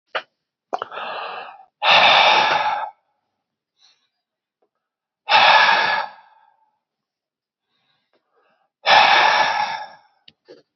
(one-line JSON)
{"exhalation_length": "10.8 s", "exhalation_amplitude": 30482, "exhalation_signal_mean_std_ratio": 0.43, "survey_phase": "beta (2021-08-13 to 2022-03-07)", "age": "45-64", "gender": "Male", "wearing_mask": "No", "symptom_cough_any": true, "symptom_runny_or_blocked_nose": true, "symptom_sore_throat": true, "symptom_headache": true, "symptom_onset": "2 days", "smoker_status": "Ex-smoker", "respiratory_condition_asthma": false, "respiratory_condition_other": false, "recruitment_source": "Test and Trace", "submission_delay": "2 days", "covid_test_result": "Positive", "covid_test_method": "RT-qPCR", "covid_ct_value": 21.7, "covid_ct_gene": "ORF1ab gene", "covid_ct_mean": 22.5, "covid_viral_load": "43000 copies/ml", "covid_viral_load_category": "Low viral load (10K-1M copies/ml)"}